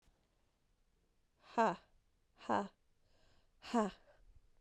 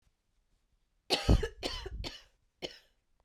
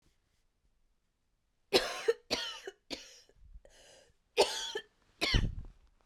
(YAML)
exhalation_length: 4.6 s
exhalation_amplitude: 3071
exhalation_signal_mean_std_ratio: 0.29
cough_length: 3.2 s
cough_amplitude: 9971
cough_signal_mean_std_ratio: 0.32
three_cough_length: 6.1 s
three_cough_amplitude: 8624
three_cough_signal_mean_std_ratio: 0.34
survey_phase: beta (2021-08-13 to 2022-03-07)
age: 18-44
gender: Female
wearing_mask: 'No'
symptom_cough_any: true
symptom_new_continuous_cough: true
symptom_runny_or_blocked_nose: true
symptom_shortness_of_breath: true
symptom_sore_throat: true
symptom_fatigue: true
symptom_fever_high_temperature: true
symptom_headache: true
symptom_change_to_sense_of_smell_or_taste: true
symptom_other: true
symptom_onset: 3 days
smoker_status: Ex-smoker
respiratory_condition_asthma: true
respiratory_condition_other: false
recruitment_source: Test and Trace
submission_delay: 2 days
covid_test_result: Positive
covid_test_method: RT-qPCR
covid_ct_value: 20.3
covid_ct_gene: ORF1ab gene
covid_ct_mean: 20.9
covid_viral_load: 130000 copies/ml
covid_viral_load_category: Low viral load (10K-1M copies/ml)